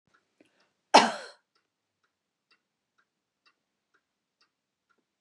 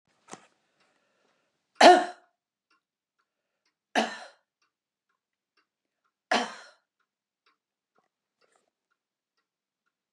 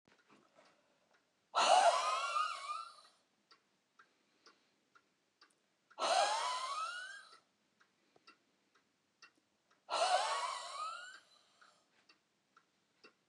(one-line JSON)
{"cough_length": "5.2 s", "cough_amplitude": 19678, "cough_signal_mean_std_ratio": 0.13, "three_cough_length": "10.1 s", "three_cough_amplitude": 24734, "three_cough_signal_mean_std_ratio": 0.16, "exhalation_length": "13.3 s", "exhalation_amplitude": 5338, "exhalation_signal_mean_std_ratio": 0.38, "survey_phase": "beta (2021-08-13 to 2022-03-07)", "age": "65+", "gender": "Female", "wearing_mask": "No", "symptom_none": true, "smoker_status": "Ex-smoker", "respiratory_condition_asthma": false, "respiratory_condition_other": false, "recruitment_source": "REACT", "submission_delay": "1 day", "covid_test_result": "Negative", "covid_test_method": "RT-qPCR", "influenza_a_test_result": "Negative", "influenza_b_test_result": "Negative"}